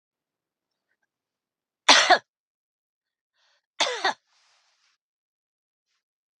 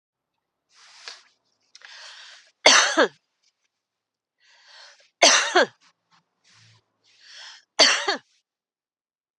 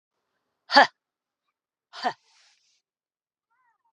{"cough_length": "6.4 s", "cough_amplitude": 30110, "cough_signal_mean_std_ratio": 0.2, "three_cough_length": "9.4 s", "three_cough_amplitude": 31038, "three_cough_signal_mean_std_ratio": 0.27, "exhalation_length": "3.9 s", "exhalation_amplitude": 29871, "exhalation_signal_mean_std_ratio": 0.16, "survey_phase": "beta (2021-08-13 to 2022-03-07)", "age": "45-64", "gender": "Female", "wearing_mask": "No", "symptom_cough_any": true, "symptom_sore_throat": true, "smoker_status": "Never smoked", "respiratory_condition_asthma": false, "respiratory_condition_other": false, "recruitment_source": "REACT", "submission_delay": "2 days", "covid_test_result": "Positive", "covid_test_method": "RT-qPCR", "covid_ct_value": 22.0, "covid_ct_gene": "E gene", "influenza_a_test_result": "Negative", "influenza_b_test_result": "Negative"}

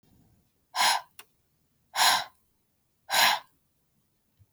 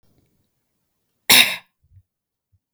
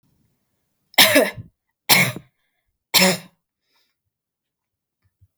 {"exhalation_length": "4.5 s", "exhalation_amplitude": 12201, "exhalation_signal_mean_std_ratio": 0.34, "cough_length": "2.7 s", "cough_amplitude": 32768, "cough_signal_mean_std_ratio": 0.22, "three_cough_length": "5.4 s", "three_cough_amplitude": 32768, "three_cough_signal_mean_std_ratio": 0.29, "survey_phase": "beta (2021-08-13 to 2022-03-07)", "age": "18-44", "gender": "Female", "wearing_mask": "No", "symptom_none": true, "smoker_status": "Never smoked", "respiratory_condition_asthma": false, "respiratory_condition_other": false, "recruitment_source": "REACT", "submission_delay": "1 day", "covid_test_result": "Negative", "covid_test_method": "RT-qPCR"}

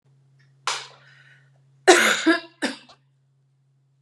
{"cough_length": "4.0 s", "cough_amplitude": 32273, "cough_signal_mean_std_ratio": 0.31, "survey_phase": "beta (2021-08-13 to 2022-03-07)", "age": "18-44", "gender": "Female", "wearing_mask": "No", "symptom_none": true, "smoker_status": "Current smoker (e-cigarettes or vapes only)", "respiratory_condition_asthma": false, "respiratory_condition_other": false, "recruitment_source": "REACT", "submission_delay": "4 days", "covid_test_result": "Negative", "covid_test_method": "RT-qPCR"}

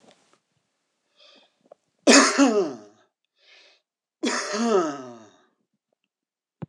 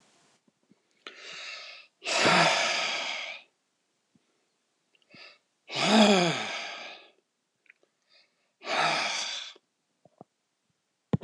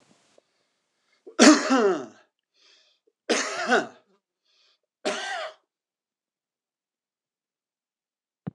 {"cough_length": "6.7 s", "cough_amplitude": 26027, "cough_signal_mean_std_ratio": 0.34, "exhalation_length": "11.2 s", "exhalation_amplitude": 15762, "exhalation_signal_mean_std_ratio": 0.4, "three_cough_length": "8.5 s", "three_cough_amplitude": 25392, "three_cough_signal_mean_std_ratio": 0.28, "survey_phase": "alpha (2021-03-01 to 2021-08-12)", "age": "65+", "gender": "Male", "wearing_mask": "No", "symptom_none": true, "smoker_status": "Ex-smoker", "respiratory_condition_asthma": false, "respiratory_condition_other": false, "recruitment_source": "REACT", "submission_delay": "2 days", "covid_test_result": "Negative", "covid_test_method": "RT-qPCR"}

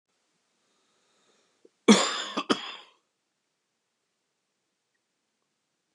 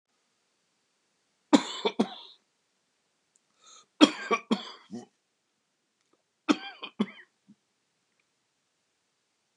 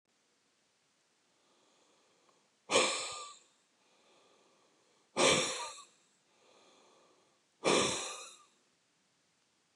{"cough_length": "5.9 s", "cough_amplitude": 19056, "cough_signal_mean_std_ratio": 0.19, "three_cough_length": "9.6 s", "three_cough_amplitude": 23828, "three_cough_signal_mean_std_ratio": 0.2, "exhalation_length": "9.8 s", "exhalation_amplitude": 6461, "exhalation_signal_mean_std_ratio": 0.3, "survey_phase": "beta (2021-08-13 to 2022-03-07)", "age": "45-64", "gender": "Male", "wearing_mask": "No", "symptom_cough_any": true, "symptom_runny_or_blocked_nose": true, "symptom_change_to_sense_of_smell_or_taste": true, "symptom_loss_of_taste": true, "symptom_onset": "4 days", "smoker_status": "Ex-smoker", "respiratory_condition_asthma": false, "respiratory_condition_other": false, "recruitment_source": "Test and Trace", "submission_delay": "2 days", "covid_test_result": "Positive", "covid_test_method": "RT-qPCR", "covid_ct_value": 17.0, "covid_ct_gene": "ORF1ab gene", "covid_ct_mean": 18.0, "covid_viral_load": "1300000 copies/ml", "covid_viral_load_category": "High viral load (>1M copies/ml)"}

